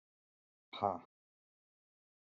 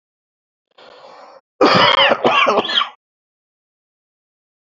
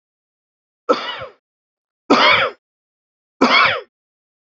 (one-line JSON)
{"exhalation_length": "2.2 s", "exhalation_amplitude": 3721, "exhalation_signal_mean_std_ratio": 0.19, "cough_length": "4.6 s", "cough_amplitude": 29856, "cough_signal_mean_std_ratio": 0.41, "three_cough_length": "4.5 s", "three_cough_amplitude": 32767, "three_cough_signal_mean_std_ratio": 0.37, "survey_phase": "beta (2021-08-13 to 2022-03-07)", "age": "45-64", "gender": "Male", "wearing_mask": "No", "symptom_cough_any": true, "symptom_runny_or_blocked_nose": true, "symptom_sore_throat": true, "symptom_fatigue": true, "symptom_headache": true, "smoker_status": "Current smoker (11 or more cigarettes per day)", "respiratory_condition_asthma": false, "respiratory_condition_other": true, "recruitment_source": "REACT", "submission_delay": "3 days", "covid_test_result": "Negative", "covid_test_method": "RT-qPCR", "influenza_a_test_result": "Negative", "influenza_b_test_result": "Negative"}